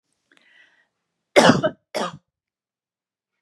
cough_length: 3.4 s
cough_amplitude: 32768
cough_signal_mean_std_ratio: 0.25
survey_phase: beta (2021-08-13 to 2022-03-07)
age: 18-44
gender: Female
wearing_mask: 'No'
symptom_none: true
smoker_status: Never smoked
respiratory_condition_asthma: false
respiratory_condition_other: false
recruitment_source: REACT
submission_delay: 3 days
covid_test_result: Negative
covid_test_method: RT-qPCR
influenza_a_test_result: Negative
influenza_b_test_result: Negative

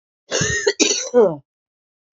cough_length: 2.1 s
cough_amplitude: 27445
cough_signal_mean_std_ratio: 0.5
survey_phase: beta (2021-08-13 to 2022-03-07)
age: 45-64
gender: Female
wearing_mask: 'No'
symptom_new_continuous_cough: true
symptom_runny_or_blocked_nose: true
symptom_sore_throat: true
symptom_diarrhoea: true
symptom_fatigue: true
symptom_fever_high_temperature: true
symptom_headache: true
symptom_change_to_sense_of_smell_or_taste: true
symptom_onset: 4 days
smoker_status: Never smoked
respiratory_condition_asthma: true
respiratory_condition_other: false
recruitment_source: Test and Trace
submission_delay: 1 day
covid_test_result: Positive
covid_test_method: ePCR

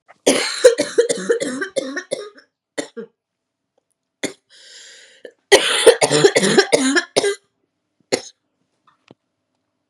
cough_length: 9.9 s
cough_amplitude: 32768
cough_signal_mean_std_ratio: 0.4
survey_phase: beta (2021-08-13 to 2022-03-07)
age: 18-44
gender: Female
wearing_mask: 'No'
symptom_cough_any: true
symptom_runny_or_blocked_nose: true
symptom_fatigue: true
symptom_other: true
symptom_onset: 4 days
smoker_status: Ex-smoker
respiratory_condition_asthma: false
respiratory_condition_other: false
recruitment_source: Test and Trace
submission_delay: 2 days
covid_test_result: Positive
covid_test_method: RT-qPCR
covid_ct_value: 19.6
covid_ct_gene: N gene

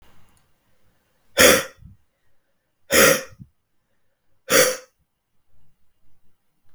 exhalation_length: 6.7 s
exhalation_amplitude: 32768
exhalation_signal_mean_std_ratio: 0.29
survey_phase: beta (2021-08-13 to 2022-03-07)
age: 45-64
gender: Male
wearing_mask: 'No'
symptom_cough_any: true
symptom_runny_or_blocked_nose: true
symptom_fatigue: true
symptom_headache: true
symptom_onset: 2 days
smoker_status: Never smoked
respiratory_condition_asthma: false
respiratory_condition_other: false
recruitment_source: Test and Trace
submission_delay: 2 days
covid_test_result: Positive
covid_test_method: RT-qPCR
covid_ct_value: 17.4
covid_ct_gene: ORF1ab gene
covid_ct_mean: 18.1
covid_viral_load: 1100000 copies/ml
covid_viral_load_category: High viral load (>1M copies/ml)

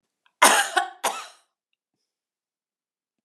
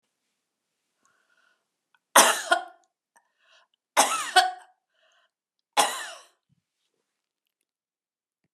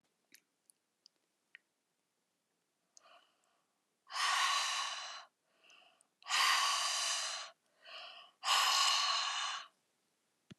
cough_length: 3.2 s
cough_amplitude: 32767
cough_signal_mean_std_ratio: 0.28
three_cough_length: 8.5 s
three_cough_amplitude: 30776
three_cough_signal_mean_std_ratio: 0.24
exhalation_length: 10.6 s
exhalation_amplitude: 4050
exhalation_signal_mean_std_ratio: 0.47
survey_phase: beta (2021-08-13 to 2022-03-07)
age: 65+
gender: Female
wearing_mask: 'No'
symptom_none: true
smoker_status: Never smoked
respiratory_condition_asthma: false
respiratory_condition_other: false
recruitment_source: REACT
submission_delay: 2 days
covid_test_result: Negative
covid_test_method: RT-qPCR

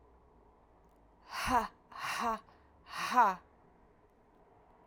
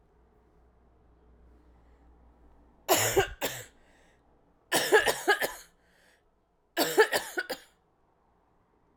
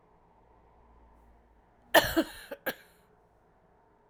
exhalation_length: 4.9 s
exhalation_amplitude: 6865
exhalation_signal_mean_std_ratio: 0.37
three_cough_length: 9.0 s
three_cough_amplitude: 13146
three_cough_signal_mean_std_ratio: 0.33
cough_length: 4.1 s
cough_amplitude: 19247
cough_signal_mean_std_ratio: 0.22
survey_phase: alpha (2021-03-01 to 2021-08-12)
age: 45-64
gender: Female
wearing_mask: 'No'
symptom_cough_any: true
symptom_fatigue: true
smoker_status: Never smoked
respiratory_condition_asthma: false
respiratory_condition_other: false
recruitment_source: Test and Trace
submission_delay: 2 days
covid_test_result: Positive
covid_test_method: RT-qPCR
covid_ct_value: 16.8
covid_ct_gene: N gene
covid_ct_mean: 17.8
covid_viral_load: 1400000 copies/ml
covid_viral_load_category: High viral load (>1M copies/ml)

